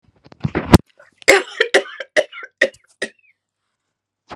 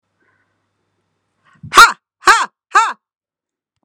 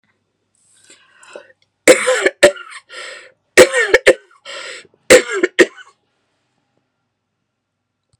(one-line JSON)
{"cough_length": "4.4 s", "cough_amplitude": 32768, "cough_signal_mean_std_ratio": 0.28, "exhalation_length": "3.8 s", "exhalation_amplitude": 32768, "exhalation_signal_mean_std_ratio": 0.27, "three_cough_length": "8.2 s", "three_cough_amplitude": 32768, "three_cough_signal_mean_std_ratio": 0.3, "survey_phase": "beta (2021-08-13 to 2022-03-07)", "age": "18-44", "gender": "Female", "wearing_mask": "No", "symptom_prefer_not_to_say": true, "smoker_status": "Ex-smoker", "respiratory_condition_asthma": true, "respiratory_condition_other": false, "recruitment_source": "REACT", "submission_delay": "0 days", "covid_test_result": "Negative", "covid_test_method": "RT-qPCR"}